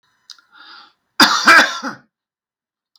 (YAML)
cough_length: 3.0 s
cough_amplitude: 32768
cough_signal_mean_std_ratio: 0.34
survey_phase: beta (2021-08-13 to 2022-03-07)
age: 45-64
gender: Male
wearing_mask: 'No'
symptom_none: true
smoker_status: Ex-smoker
respiratory_condition_asthma: false
respiratory_condition_other: false
recruitment_source: REACT
submission_delay: 6 days
covid_test_result: Negative
covid_test_method: RT-qPCR
influenza_a_test_result: Negative
influenza_b_test_result: Negative